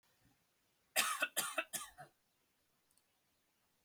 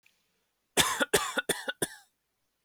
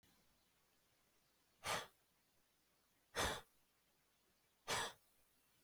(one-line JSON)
{"three_cough_length": "3.8 s", "three_cough_amplitude": 4451, "three_cough_signal_mean_std_ratio": 0.32, "cough_length": "2.6 s", "cough_amplitude": 12902, "cough_signal_mean_std_ratio": 0.38, "exhalation_length": "5.6 s", "exhalation_amplitude": 1336, "exhalation_signal_mean_std_ratio": 0.3, "survey_phase": "beta (2021-08-13 to 2022-03-07)", "age": "18-44", "gender": "Male", "wearing_mask": "No", "symptom_none": true, "smoker_status": "Never smoked", "respiratory_condition_asthma": false, "respiratory_condition_other": false, "recruitment_source": "REACT", "submission_delay": "4 days", "covid_test_result": "Negative", "covid_test_method": "RT-qPCR", "influenza_a_test_result": "Unknown/Void", "influenza_b_test_result": "Unknown/Void"}